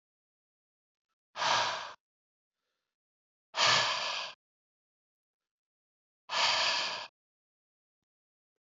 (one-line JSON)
{"exhalation_length": "8.7 s", "exhalation_amplitude": 8076, "exhalation_signal_mean_std_ratio": 0.36, "survey_phase": "beta (2021-08-13 to 2022-03-07)", "age": "45-64", "gender": "Male", "wearing_mask": "No", "symptom_none": true, "smoker_status": "Ex-smoker", "respiratory_condition_asthma": false, "respiratory_condition_other": false, "recruitment_source": "REACT", "submission_delay": "2 days", "covid_test_result": "Negative", "covid_test_method": "RT-qPCR"}